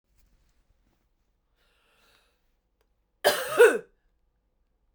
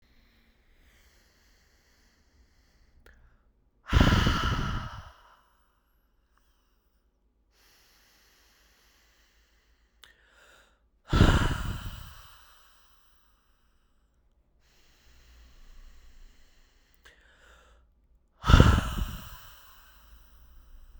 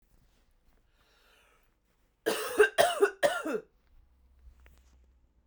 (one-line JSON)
{"cough_length": "4.9 s", "cough_amplitude": 16279, "cough_signal_mean_std_ratio": 0.21, "exhalation_length": "21.0 s", "exhalation_amplitude": 26144, "exhalation_signal_mean_std_ratio": 0.25, "three_cough_length": "5.5 s", "three_cough_amplitude": 12010, "three_cough_signal_mean_std_ratio": 0.31, "survey_phase": "beta (2021-08-13 to 2022-03-07)", "age": "18-44", "gender": "Female", "wearing_mask": "No", "symptom_cough_any": true, "symptom_runny_or_blocked_nose": true, "symptom_sore_throat": true, "symptom_diarrhoea": true, "symptom_onset": "3 days", "smoker_status": "Never smoked", "respiratory_condition_asthma": false, "respiratory_condition_other": false, "recruitment_source": "Test and Trace", "submission_delay": "1 day", "covid_test_result": "Positive", "covid_test_method": "ePCR"}